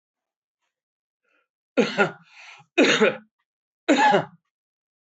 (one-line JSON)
{"three_cough_length": "5.1 s", "three_cough_amplitude": 18825, "three_cough_signal_mean_std_ratio": 0.35, "survey_phase": "alpha (2021-03-01 to 2021-08-12)", "age": "65+", "gender": "Male", "wearing_mask": "No", "symptom_none": true, "smoker_status": "Ex-smoker", "respiratory_condition_asthma": false, "respiratory_condition_other": false, "recruitment_source": "REACT", "submission_delay": "2 days", "covid_test_result": "Negative", "covid_test_method": "RT-qPCR"}